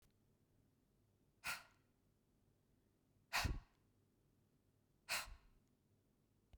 {"exhalation_length": "6.6 s", "exhalation_amplitude": 1452, "exhalation_signal_mean_std_ratio": 0.27, "survey_phase": "beta (2021-08-13 to 2022-03-07)", "age": "45-64", "gender": "Female", "wearing_mask": "No", "symptom_none": true, "smoker_status": "Never smoked", "respiratory_condition_asthma": false, "respiratory_condition_other": false, "recruitment_source": "REACT", "submission_delay": "3 days", "covid_test_result": "Negative", "covid_test_method": "RT-qPCR", "influenza_a_test_result": "Negative", "influenza_b_test_result": "Negative"}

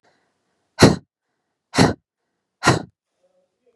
{"exhalation_length": "3.8 s", "exhalation_amplitude": 32768, "exhalation_signal_mean_std_ratio": 0.26, "survey_phase": "beta (2021-08-13 to 2022-03-07)", "age": "18-44", "gender": "Female", "wearing_mask": "No", "symptom_none": true, "smoker_status": "Never smoked", "respiratory_condition_asthma": false, "respiratory_condition_other": false, "recruitment_source": "REACT", "submission_delay": "2 days", "covid_test_result": "Negative", "covid_test_method": "RT-qPCR", "influenza_a_test_result": "Negative", "influenza_b_test_result": "Negative"}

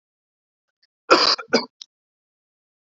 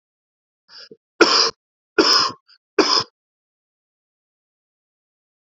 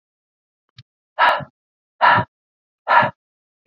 {"cough_length": "2.8 s", "cough_amplitude": 28009, "cough_signal_mean_std_ratio": 0.26, "three_cough_length": "5.5 s", "three_cough_amplitude": 27982, "three_cough_signal_mean_std_ratio": 0.3, "exhalation_length": "3.7 s", "exhalation_amplitude": 27127, "exhalation_signal_mean_std_ratio": 0.33, "survey_phase": "beta (2021-08-13 to 2022-03-07)", "age": "18-44", "gender": "Male", "wearing_mask": "No", "symptom_cough_any": true, "symptom_new_continuous_cough": true, "symptom_runny_or_blocked_nose": true, "symptom_fatigue": true, "symptom_headache": true, "symptom_onset": "3 days", "smoker_status": "Never smoked", "respiratory_condition_asthma": false, "respiratory_condition_other": false, "recruitment_source": "Test and Trace", "submission_delay": "2 days", "covid_test_result": "Positive", "covid_test_method": "RT-qPCR", "covid_ct_value": 24.0, "covid_ct_gene": "ORF1ab gene", "covid_ct_mean": 25.0, "covid_viral_load": "6300 copies/ml", "covid_viral_load_category": "Minimal viral load (< 10K copies/ml)"}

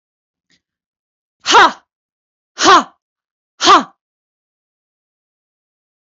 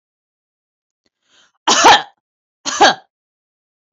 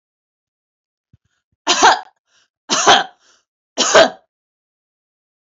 {"exhalation_length": "6.1 s", "exhalation_amplitude": 32191, "exhalation_signal_mean_std_ratio": 0.28, "cough_length": "3.9 s", "cough_amplitude": 30760, "cough_signal_mean_std_ratio": 0.3, "three_cough_length": "5.5 s", "three_cough_amplitude": 30289, "three_cough_signal_mean_std_ratio": 0.31, "survey_phase": "beta (2021-08-13 to 2022-03-07)", "age": "18-44", "gender": "Female", "wearing_mask": "No", "symptom_sore_throat": true, "symptom_diarrhoea": true, "symptom_onset": "1 day", "smoker_status": "Never smoked", "respiratory_condition_asthma": false, "respiratory_condition_other": false, "recruitment_source": "Test and Trace", "submission_delay": "0 days", "covid_test_result": "Negative", "covid_test_method": "ePCR"}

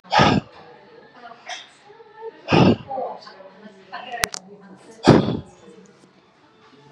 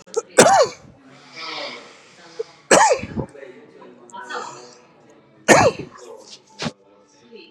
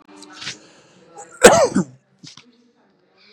{"exhalation_length": "6.9 s", "exhalation_amplitude": 32768, "exhalation_signal_mean_std_ratio": 0.35, "three_cough_length": "7.5 s", "three_cough_amplitude": 32768, "three_cough_signal_mean_std_ratio": 0.36, "cough_length": "3.3 s", "cough_amplitude": 32768, "cough_signal_mean_std_ratio": 0.27, "survey_phase": "beta (2021-08-13 to 2022-03-07)", "age": "45-64", "gender": "Male", "wearing_mask": "No", "symptom_none": true, "smoker_status": "Never smoked", "respiratory_condition_asthma": false, "respiratory_condition_other": false, "recruitment_source": "REACT", "submission_delay": "5 days", "covid_test_result": "Negative", "covid_test_method": "RT-qPCR", "influenza_a_test_result": "Negative", "influenza_b_test_result": "Negative"}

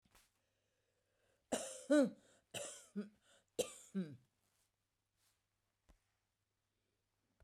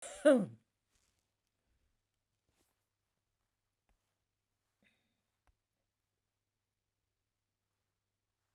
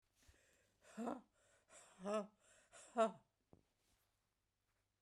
{"three_cough_length": "7.4 s", "three_cough_amplitude": 2808, "three_cough_signal_mean_std_ratio": 0.24, "cough_length": "8.5 s", "cough_amplitude": 6448, "cough_signal_mean_std_ratio": 0.13, "exhalation_length": "5.0 s", "exhalation_amplitude": 1839, "exhalation_signal_mean_std_ratio": 0.27, "survey_phase": "beta (2021-08-13 to 2022-03-07)", "age": "65+", "gender": "Female", "wearing_mask": "No", "symptom_none": true, "smoker_status": "Never smoked", "respiratory_condition_asthma": false, "respiratory_condition_other": false, "recruitment_source": "REACT", "submission_delay": "2 days", "covid_test_result": "Negative", "covid_test_method": "RT-qPCR"}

